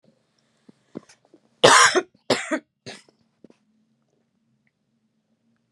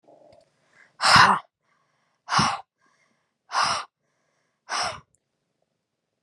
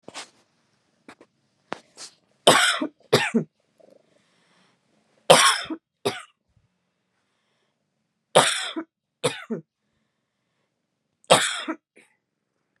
cough_length: 5.7 s
cough_amplitude: 32767
cough_signal_mean_std_ratio: 0.23
exhalation_length: 6.2 s
exhalation_amplitude: 26254
exhalation_signal_mean_std_ratio: 0.31
three_cough_length: 12.8 s
three_cough_amplitude: 32767
three_cough_signal_mean_std_ratio: 0.27
survey_phase: beta (2021-08-13 to 2022-03-07)
age: 45-64
gender: Female
wearing_mask: 'No'
symptom_cough_any: true
symptom_new_continuous_cough: true
symptom_runny_or_blocked_nose: true
symptom_sore_throat: true
symptom_diarrhoea: true
symptom_onset: 11 days
smoker_status: Ex-smoker
respiratory_condition_asthma: false
respiratory_condition_other: false
recruitment_source: REACT
submission_delay: 3 days
covid_test_result: Negative
covid_test_method: RT-qPCR
influenza_a_test_result: Negative
influenza_b_test_result: Negative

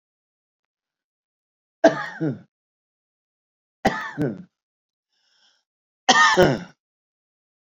three_cough_length: 7.8 s
three_cough_amplitude: 29769
three_cough_signal_mean_std_ratio: 0.28
survey_phase: beta (2021-08-13 to 2022-03-07)
age: 65+
gender: Male
wearing_mask: 'No'
symptom_none: true
smoker_status: Ex-smoker
respiratory_condition_asthma: false
respiratory_condition_other: false
recruitment_source: REACT
submission_delay: 3 days
covid_test_result: Negative
covid_test_method: RT-qPCR
influenza_a_test_result: Negative
influenza_b_test_result: Negative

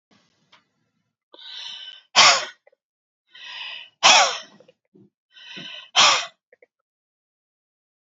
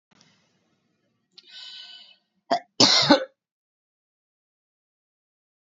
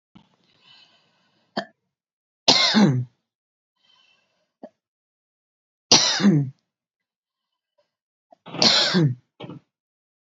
exhalation_length: 8.1 s
exhalation_amplitude: 32380
exhalation_signal_mean_std_ratio: 0.28
cough_length: 5.6 s
cough_amplitude: 32688
cough_signal_mean_std_ratio: 0.23
three_cough_length: 10.3 s
three_cough_amplitude: 32768
three_cough_signal_mean_std_ratio: 0.33
survey_phase: beta (2021-08-13 to 2022-03-07)
age: 65+
gender: Female
wearing_mask: 'No'
symptom_none: true
smoker_status: Ex-smoker
respiratory_condition_asthma: false
respiratory_condition_other: false
recruitment_source: REACT
submission_delay: 1 day
covid_test_result: Negative
covid_test_method: RT-qPCR
influenza_a_test_result: Negative
influenza_b_test_result: Negative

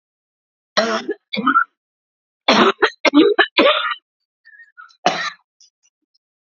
cough_length: 6.5 s
cough_amplitude: 29912
cough_signal_mean_std_ratio: 0.41
survey_phase: alpha (2021-03-01 to 2021-08-12)
age: 45-64
gender: Female
wearing_mask: 'No'
symptom_cough_any: true
symptom_fatigue: true
symptom_headache: true
symptom_onset: 4 days
smoker_status: Ex-smoker
respiratory_condition_asthma: false
respiratory_condition_other: false
recruitment_source: Test and Trace
submission_delay: 2 days
covid_test_result: Positive
covid_test_method: RT-qPCR
covid_ct_value: 27.8
covid_ct_gene: ORF1ab gene
covid_ct_mean: 27.9
covid_viral_load: 720 copies/ml
covid_viral_load_category: Minimal viral load (< 10K copies/ml)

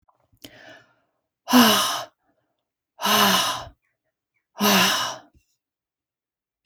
exhalation_length: 6.7 s
exhalation_amplitude: 26728
exhalation_signal_mean_std_ratio: 0.39
survey_phase: beta (2021-08-13 to 2022-03-07)
age: 45-64
gender: Female
wearing_mask: 'No'
symptom_none: true
smoker_status: Never smoked
respiratory_condition_asthma: false
respiratory_condition_other: false
recruitment_source: REACT
submission_delay: 5 days
covid_test_result: Negative
covid_test_method: RT-qPCR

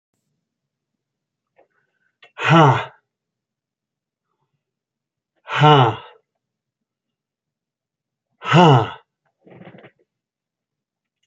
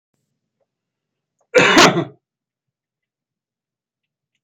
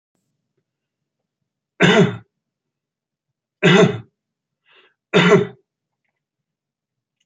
exhalation_length: 11.3 s
exhalation_amplitude: 27756
exhalation_signal_mean_std_ratio: 0.26
cough_length: 4.4 s
cough_amplitude: 32367
cough_signal_mean_std_ratio: 0.26
three_cough_length: 7.3 s
three_cough_amplitude: 32767
three_cough_signal_mean_std_ratio: 0.29
survey_phase: beta (2021-08-13 to 2022-03-07)
age: 65+
gender: Male
wearing_mask: 'No'
symptom_none: true
smoker_status: Ex-smoker
respiratory_condition_asthma: false
respiratory_condition_other: false
recruitment_source: REACT
submission_delay: 3 days
covid_test_result: Negative
covid_test_method: RT-qPCR
influenza_a_test_result: Negative
influenza_b_test_result: Negative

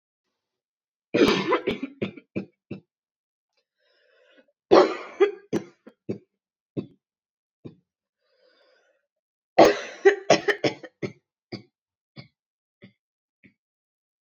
three_cough_length: 14.3 s
three_cough_amplitude: 27754
three_cough_signal_mean_std_ratio: 0.26
survey_phase: beta (2021-08-13 to 2022-03-07)
age: 18-44
gender: Female
wearing_mask: 'No'
symptom_cough_any: true
symptom_new_continuous_cough: true
symptom_runny_or_blocked_nose: true
symptom_shortness_of_breath: true
symptom_sore_throat: true
symptom_diarrhoea: true
symptom_fatigue: true
symptom_headache: true
symptom_onset: 4 days
smoker_status: Never smoked
respiratory_condition_asthma: false
respiratory_condition_other: false
recruitment_source: Test and Trace
submission_delay: 1 day
covid_test_result: Positive
covid_test_method: RT-qPCR
covid_ct_value: 13.8
covid_ct_gene: ORF1ab gene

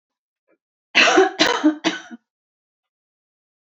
three_cough_length: 3.7 s
three_cough_amplitude: 28319
three_cough_signal_mean_std_ratio: 0.37
survey_phase: beta (2021-08-13 to 2022-03-07)
age: 18-44
gender: Female
wearing_mask: 'No'
symptom_headache: true
smoker_status: Never smoked
respiratory_condition_asthma: false
respiratory_condition_other: false
recruitment_source: REACT
submission_delay: 1 day
covid_test_result: Negative
covid_test_method: RT-qPCR
influenza_a_test_result: Negative
influenza_b_test_result: Negative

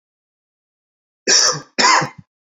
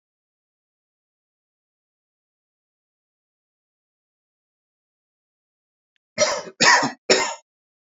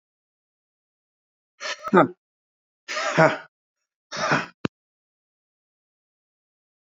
cough_length: 2.5 s
cough_amplitude: 31965
cough_signal_mean_std_ratio: 0.4
three_cough_length: 7.9 s
three_cough_amplitude: 28737
three_cough_signal_mean_std_ratio: 0.22
exhalation_length: 6.9 s
exhalation_amplitude: 27595
exhalation_signal_mean_std_ratio: 0.26
survey_phase: beta (2021-08-13 to 2022-03-07)
age: 45-64
gender: Male
wearing_mask: 'No'
symptom_none: true
smoker_status: Current smoker (e-cigarettes or vapes only)
respiratory_condition_asthma: false
respiratory_condition_other: false
recruitment_source: REACT
submission_delay: 2 days
covid_test_result: Negative
covid_test_method: RT-qPCR
influenza_a_test_result: Unknown/Void
influenza_b_test_result: Unknown/Void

